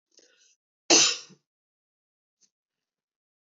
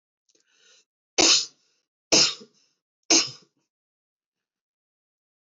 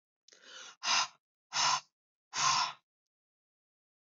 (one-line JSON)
{"cough_length": "3.6 s", "cough_amplitude": 19128, "cough_signal_mean_std_ratio": 0.21, "three_cough_length": "5.5 s", "three_cough_amplitude": 18027, "three_cough_signal_mean_std_ratio": 0.26, "exhalation_length": "4.1 s", "exhalation_amplitude": 5881, "exhalation_signal_mean_std_ratio": 0.39, "survey_phase": "beta (2021-08-13 to 2022-03-07)", "age": "45-64", "gender": "Female", "wearing_mask": "No", "symptom_none": true, "smoker_status": "Never smoked", "respiratory_condition_asthma": false, "respiratory_condition_other": false, "recruitment_source": "REACT", "submission_delay": "1 day", "covid_test_result": "Negative", "covid_test_method": "RT-qPCR", "influenza_a_test_result": "Negative", "influenza_b_test_result": "Negative"}